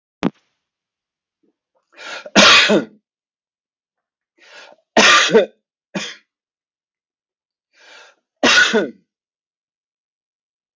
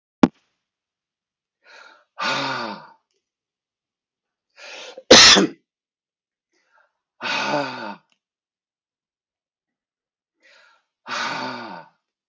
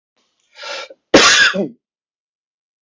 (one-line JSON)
{"three_cough_length": "10.8 s", "three_cough_amplitude": 32736, "three_cough_signal_mean_std_ratio": 0.31, "exhalation_length": "12.3 s", "exhalation_amplitude": 32743, "exhalation_signal_mean_std_ratio": 0.24, "cough_length": "2.8 s", "cough_amplitude": 32768, "cough_signal_mean_std_ratio": 0.37, "survey_phase": "beta (2021-08-13 to 2022-03-07)", "age": "65+", "gender": "Male", "wearing_mask": "No", "symptom_cough_any": true, "symptom_runny_or_blocked_nose": true, "symptom_abdominal_pain": true, "symptom_fatigue": true, "symptom_onset": "12 days", "smoker_status": "Ex-smoker", "respiratory_condition_asthma": false, "respiratory_condition_other": false, "recruitment_source": "REACT", "submission_delay": "2 days", "covid_test_result": "Negative", "covid_test_method": "RT-qPCR", "influenza_a_test_result": "Negative", "influenza_b_test_result": "Negative"}